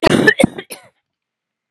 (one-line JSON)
{"cough_length": "1.7 s", "cough_amplitude": 32768, "cough_signal_mean_std_ratio": 0.37, "survey_phase": "beta (2021-08-13 to 2022-03-07)", "age": "45-64", "gender": "Female", "wearing_mask": "No", "symptom_cough_any": true, "symptom_shortness_of_breath": true, "symptom_sore_throat": true, "symptom_fatigue": true, "symptom_change_to_sense_of_smell_or_taste": true, "smoker_status": "Ex-smoker", "respiratory_condition_asthma": false, "respiratory_condition_other": false, "recruitment_source": "Test and Trace", "submission_delay": "1 day", "covid_test_result": "Positive", "covid_test_method": "LFT"}